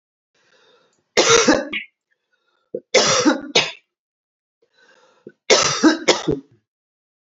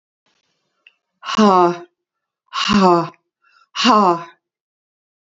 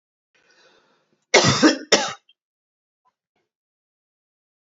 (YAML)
three_cough_length: 7.3 s
three_cough_amplitude: 32768
three_cough_signal_mean_std_ratio: 0.39
exhalation_length: 5.3 s
exhalation_amplitude: 32016
exhalation_signal_mean_std_ratio: 0.41
cough_length: 4.6 s
cough_amplitude: 32767
cough_signal_mean_std_ratio: 0.26
survey_phase: beta (2021-08-13 to 2022-03-07)
age: 45-64
gender: Female
wearing_mask: 'No'
symptom_cough_any: true
symptom_runny_or_blocked_nose: true
symptom_fatigue: true
symptom_headache: true
symptom_other: true
symptom_onset: 3 days
smoker_status: Ex-smoker
respiratory_condition_asthma: false
respiratory_condition_other: false
recruitment_source: Test and Trace
submission_delay: 1 day
covid_test_result: Positive
covid_test_method: RT-qPCR
covid_ct_value: 25.4
covid_ct_gene: N gene